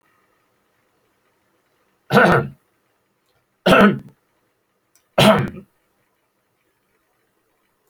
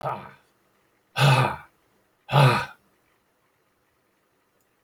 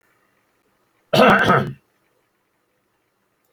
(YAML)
three_cough_length: 7.9 s
three_cough_amplitude: 29213
three_cough_signal_mean_std_ratio: 0.28
exhalation_length: 4.8 s
exhalation_amplitude: 22277
exhalation_signal_mean_std_ratio: 0.33
cough_length: 3.5 s
cough_amplitude: 26736
cough_signal_mean_std_ratio: 0.32
survey_phase: alpha (2021-03-01 to 2021-08-12)
age: 65+
gender: Male
wearing_mask: 'No'
symptom_none: true
smoker_status: Ex-smoker
respiratory_condition_asthma: false
respiratory_condition_other: false
recruitment_source: REACT
submission_delay: 1 day
covid_test_result: Negative
covid_test_method: RT-qPCR